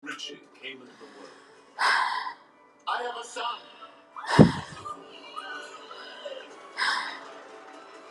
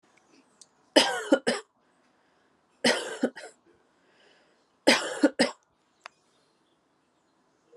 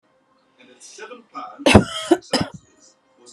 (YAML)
exhalation_length: 8.1 s
exhalation_amplitude: 30843
exhalation_signal_mean_std_ratio: 0.39
three_cough_length: 7.8 s
three_cough_amplitude: 21875
three_cough_signal_mean_std_ratio: 0.28
cough_length: 3.3 s
cough_amplitude: 32768
cough_signal_mean_std_ratio: 0.29
survey_phase: beta (2021-08-13 to 2022-03-07)
age: 18-44
gender: Female
wearing_mask: 'Yes'
symptom_runny_or_blocked_nose: true
symptom_shortness_of_breath: true
symptom_diarrhoea: true
symptom_other: true
smoker_status: Prefer not to say
respiratory_condition_asthma: false
respiratory_condition_other: false
recruitment_source: Test and Trace
submission_delay: 1 day
covid_test_result: Positive
covid_test_method: RT-qPCR